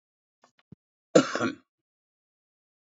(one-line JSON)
{"cough_length": "2.8 s", "cough_amplitude": 18630, "cough_signal_mean_std_ratio": 0.21, "survey_phase": "beta (2021-08-13 to 2022-03-07)", "age": "65+", "gender": "Male", "wearing_mask": "No", "symptom_runny_or_blocked_nose": true, "symptom_headache": true, "smoker_status": "Ex-smoker", "respiratory_condition_asthma": false, "respiratory_condition_other": false, "recruitment_source": "Test and Trace", "submission_delay": "2 days", "covid_test_result": "Positive", "covid_test_method": "LFT"}